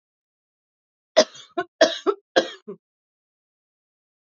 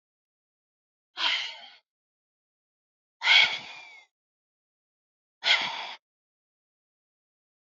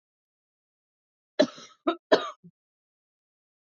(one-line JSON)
{"cough_length": "4.3 s", "cough_amplitude": 28388, "cough_signal_mean_std_ratio": 0.23, "exhalation_length": "7.8 s", "exhalation_amplitude": 14961, "exhalation_signal_mean_std_ratio": 0.27, "three_cough_length": "3.8 s", "three_cough_amplitude": 18643, "three_cough_signal_mean_std_ratio": 0.2, "survey_phase": "alpha (2021-03-01 to 2021-08-12)", "age": "45-64", "gender": "Female", "wearing_mask": "No", "symptom_cough_any": true, "smoker_status": "Ex-smoker", "respiratory_condition_asthma": false, "respiratory_condition_other": false, "recruitment_source": "Test and Trace", "submission_delay": "2 days", "covid_test_result": "Positive", "covid_test_method": "RT-qPCR"}